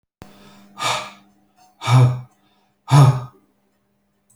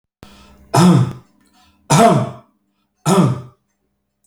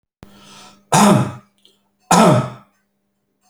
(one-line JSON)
{"exhalation_length": "4.4 s", "exhalation_amplitude": 27174, "exhalation_signal_mean_std_ratio": 0.35, "three_cough_length": "4.3 s", "three_cough_amplitude": 32083, "three_cough_signal_mean_std_ratio": 0.43, "cough_length": "3.5 s", "cough_amplitude": 32768, "cough_signal_mean_std_ratio": 0.39, "survey_phase": "alpha (2021-03-01 to 2021-08-12)", "age": "65+", "gender": "Male", "wearing_mask": "No", "symptom_none": true, "smoker_status": "Ex-smoker", "respiratory_condition_asthma": false, "respiratory_condition_other": false, "recruitment_source": "REACT", "submission_delay": "1 day", "covid_test_result": "Negative", "covid_test_method": "RT-qPCR"}